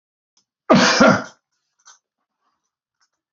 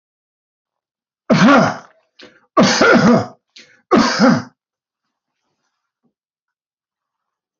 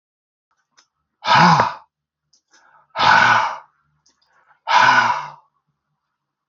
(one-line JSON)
{"cough_length": "3.3 s", "cough_amplitude": 27702, "cough_signal_mean_std_ratio": 0.32, "three_cough_length": "7.6 s", "three_cough_amplitude": 27752, "three_cough_signal_mean_std_ratio": 0.39, "exhalation_length": "6.5 s", "exhalation_amplitude": 27802, "exhalation_signal_mean_std_ratio": 0.4, "survey_phase": "beta (2021-08-13 to 2022-03-07)", "age": "65+", "gender": "Male", "wearing_mask": "No", "symptom_none": true, "smoker_status": "Ex-smoker", "respiratory_condition_asthma": false, "respiratory_condition_other": false, "recruitment_source": "REACT", "submission_delay": "2 days", "covid_test_result": "Negative", "covid_test_method": "RT-qPCR"}